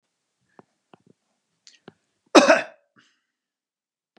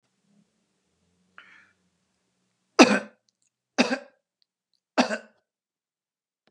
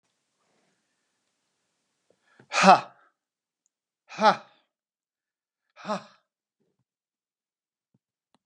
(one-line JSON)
{"cough_length": "4.2 s", "cough_amplitude": 32767, "cough_signal_mean_std_ratio": 0.18, "three_cough_length": "6.5 s", "three_cough_amplitude": 32515, "three_cough_signal_mean_std_ratio": 0.19, "exhalation_length": "8.5 s", "exhalation_amplitude": 29043, "exhalation_signal_mean_std_ratio": 0.17, "survey_phase": "beta (2021-08-13 to 2022-03-07)", "age": "45-64", "gender": "Male", "wearing_mask": "No", "symptom_none": true, "symptom_onset": "5 days", "smoker_status": "Ex-smoker", "respiratory_condition_asthma": false, "respiratory_condition_other": false, "recruitment_source": "REACT", "submission_delay": "1 day", "covid_test_result": "Negative", "covid_test_method": "RT-qPCR", "influenza_a_test_result": "Negative", "influenza_b_test_result": "Negative"}